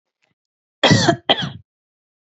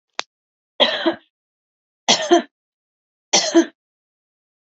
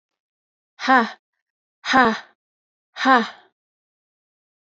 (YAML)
cough_length: 2.2 s
cough_amplitude: 32768
cough_signal_mean_std_ratio: 0.36
three_cough_length: 4.6 s
three_cough_amplitude: 30631
three_cough_signal_mean_std_ratio: 0.32
exhalation_length: 4.7 s
exhalation_amplitude: 26995
exhalation_signal_mean_std_ratio: 0.29
survey_phase: alpha (2021-03-01 to 2021-08-12)
age: 18-44
gender: Female
wearing_mask: 'No'
symptom_diarrhoea: true
symptom_fatigue: true
symptom_fever_high_temperature: true
smoker_status: Ex-smoker
respiratory_condition_asthma: false
respiratory_condition_other: false
recruitment_source: REACT
submission_delay: 1 day
covid_test_result: Negative
covid_test_method: RT-qPCR